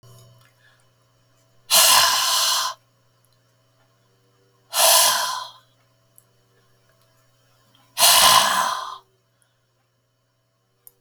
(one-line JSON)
{"exhalation_length": "11.0 s", "exhalation_amplitude": 32766, "exhalation_signal_mean_std_ratio": 0.38, "survey_phase": "beta (2021-08-13 to 2022-03-07)", "age": "65+", "gender": "Female", "wearing_mask": "No", "symptom_none": true, "smoker_status": "Ex-smoker", "respiratory_condition_asthma": false, "respiratory_condition_other": false, "recruitment_source": "REACT", "submission_delay": "2 days", "covid_test_result": "Negative", "covid_test_method": "RT-qPCR", "influenza_a_test_result": "Unknown/Void", "influenza_b_test_result": "Unknown/Void"}